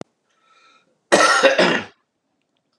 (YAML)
cough_length: 2.8 s
cough_amplitude: 30794
cough_signal_mean_std_ratio: 0.4
survey_phase: beta (2021-08-13 to 2022-03-07)
age: 65+
gender: Male
wearing_mask: 'No'
symptom_cough_any: true
symptom_runny_or_blocked_nose: true
symptom_sore_throat: true
symptom_diarrhoea: true
symptom_fatigue: true
symptom_headache: true
symptom_onset: 5 days
smoker_status: Never smoked
respiratory_condition_asthma: false
respiratory_condition_other: false
recruitment_source: Test and Trace
submission_delay: 2 days
covid_test_result: Positive
covid_test_method: ePCR